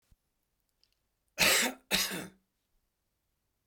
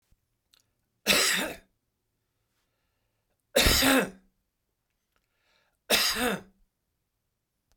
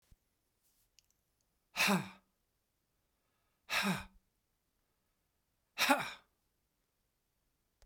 {
  "cough_length": "3.7 s",
  "cough_amplitude": 8393,
  "cough_signal_mean_std_ratio": 0.32,
  "three_cough_length": "7.8 s",
  "three_cough_amplitude": 14541,
  "three_cough_signal_mean_std_ratio": 0.34,
  "exhalation_length": "7.9 s",
  "exhalation_amplitude": 6180,
  "exhalation_signal_mean_std_ratio": 0.26,
  "survey_phase": "beta (2021-08-13 to 2022-03-07)",
  "age": "65+",
  "gender": "Male",
  "wearing_mask": "No",
  "symptom_none": true,
  "smoker_status": "Ex-smoker",
  "respiratory_condition_asthma": false,
  "respiratory_condition_other": false,
  "recruitment_source": "REACT",
  "submission_delay": "7 days",
  "covid_test_result": "Negative",
  "covid_test_method": "RT-qPCR"
}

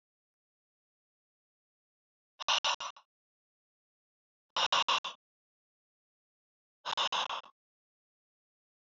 {
  "exhalation_length": "8.9 s",
  "exhalation_amplitude": 5455,
  "exhalation_signal_mean_std_ratio": 0.27,
  "survey_phase": "beta (2021-08-13 to 2022-03-07)",
  "age": "65+",
  "gender": "Male",
  "wearing_mask": "No",
  "symptom_none": true,
  "smoker_status": "Ex-smoker",
  "respiratory_condition_asthma": false,
  "respiratory_condition_other": false,
  "recruitment_source": "REACT",
  "submission_delay": "1 day",
  "covid_test_result": "Negative",
  "covid_test_method": "RT-qPCR"
}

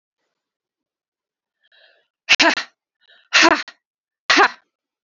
{
  "exhalation_length": "5.0 s",
  "exhalation_amplitude": 32768,
  "exhalation_signal_mean_std_ratio": 0.29,
  "survey_phase": "beta (2021-08-13 to 2022-03-07)",
  "age": "45-64",
  "gender": "Female",
  "wearing_mask": "No",
  "symptom_cough_any": true,
  "symptom_runny_or_blocked_nose": true,
  "symptom_shortness_of_breath": true,
  "symptom_sore_throat": true,
  "symptom_fatigue": true,
  "symptom_onset": "2 days",
  "smoker_status": "Never smoked",
  "respiratory_condition_asthma": false,
  "respiratory_condition_other": false,
  "recruitment_source": "Test and Trace",
  "submission_delay": "2 days",
  "covid_test_result": "Positive",
  "covid_test_method": "RT-qPCR",
  "covid_ct_value": 25.2,
  "covid_ct_gene": "ORF1ab gene",
  "covid_ct_mean": 25.7,
  "covid_viral_load": "3600 copies/ml",
  "covid_viral_load_category": "Minimal viral load (< 10K copies/ml)"
}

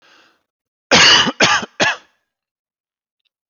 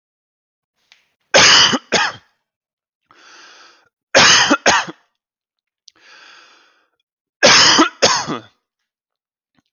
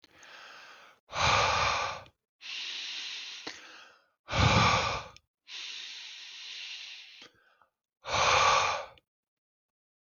{
  "cough_length": "3.5 s",
  "cough_amplitude": 32049,
  "cough_signal_mean_std_ratio": 0.38,
  "three_cough_length": "9.7 s",
  "three_cough_amplitude": 32768,
  "three_cough_signal_mean_std_ratio": 0.37,
  "exhalation_length": "10.1 s",
  "exhalation_amplitude": 9487,
  "exhalation_signal_mean_std_ratio": 0.48,
  "survey_phase": "alpha (2021-03-01 to 2021-08-12)",
  "age": "18-44",
  "gender": "Male",
  "wearing_mask": "No",
  "symptom_headache": true,
  "symptom_onset": "12 days",
  "smoker_status": "Never smoked",
  "respiratory_condition_asthma": false,
  "respiratory_condition_other": false,
  "recruitment_source": "REACT",
  "submission_delay": "1 day",
  "covid_test_result": "Negative",
  "covid_test_method": "RT-qPCR"
}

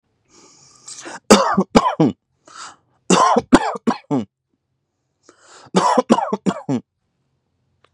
{
  "three_cough_length": "7.9 s",
  "three_cough_amplitude": 32768,
  "three_cough_signal_mean_std_ratio": 0.39,
  "survey_phase": "beta (2021-08-13 to 2022-03-07)",
  "age": "18-44",
  "gender": "Male",
  "wearing_mask": "No",
  "symptom_none": true,
  "smoker_status": "Current smoker (1 to 10 cigarettes per day)",
  "respiratory_condition_asthma": false,
  "respiratory_condition_other": false,
  "recruitment_source": "REACT",
  "submission_delay": "3 days",
  "covid_test_result": "Negative",
  "covid_test_method": "RT-qPCR",
  "influenza_a_test_result": "Negative",
  "influenza_b_test_result": "Negative"
}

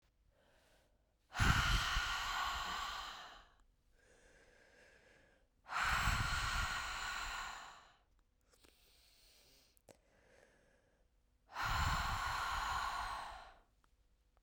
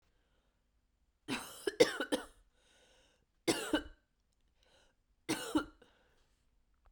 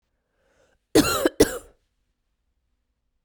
{
  "exhalation_length": "14.4 s",
  "exhalation_amplitude": 3552,
  "exhalation_signal_mean_std_ratio": 0.53,
  "three_cough_length": "6.9 s",
  "three_cough_amplitude": 8344,
  "three_cough_signal_mean_std_ratio": 0.28,
  "cough_length": "3.2 s",
  "cough_amplitude": 23234,
  "cough_signal_mean_std_ratio": 0.26,
  "survey_phase": "beta (2021-08-13 to 2022-03-07)",
  "age": "18-44",
  "gender": "Female",
  "wearing_mask": "No",
  "symptom_cough_any": true,
  "symptom_runny_or_blocked_nose": true,
  "symptom_sore_throat": true,
  "symptom_headache": true,
  "symptom_change_to_sense_of_smell_or_taste": true,
  "symptom_onset": "3 days",
  "smoker_status": "Never smoked",
  "respiratory_condition_asthma": false,
  "respiratory_condition_other": false,
  "recruitment_source": "Test and Trace",
  "submission_delay": "1 day",
  "covid_test_result": "Positive",
  "covid_test_method": "RT-qPCR",
  "covid_ct_value": 12.5,
  "covid_ct_gene": "ORF1ab gene"
}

